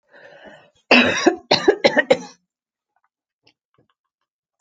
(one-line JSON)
{"cough_length": "4.6 s", "cough_amplitude": 30630, "cough_signal_mean_std_ratio": 0.32, "survey_phase": "alpha (2021-03-01 to 2021-08-12)", "age": "65+", "gender": "Female", "wearing_mask": "No", "symptom_cough_any": true, "smoker_status": "Ex-smoker", "respiratory_condition_asthma": true, "respiratory_condition_other": false, "recruitment_source": "REACT", "submission_delay": "3 days", "covid_test_result": "Negative", "covid_test_method": "RT-qPCR"}